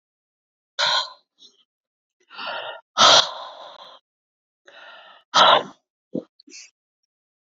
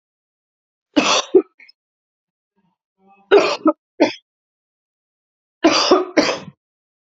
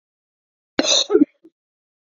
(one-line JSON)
{"exhalation_length": "7.4 s", "exhalation_amplitude": 27749, "exhalation_signal_mean_std_ratio": 0.3, "three_cough_length": "7.1 s", "three_cough_amplitude": 30965, "three_cough_signal_mean_std_ratio": 0.34, "cough_length": "2.1 s", "cough_amplitude": 28853, "cough_signal_mean_std_ratio": 0.32, "survey_phase": "beta (2021-08-13 to 2022-03-07)", "age": "45-64", "gender": "Female", "wearing_mask": "No", "symptom_cough_any": true, "symptom_runny_or_blocked_nose": true, "symptom_sore_throat": true, "smoker_status": "Never smoked", "respiratory_condition_asthma": false, "respiratory_condition_other": false, "recruitment_source": "Test and Trace", "submission_delay": "1 day", "covid_test_result": "Negative", "covid_test_method": "ePCR"}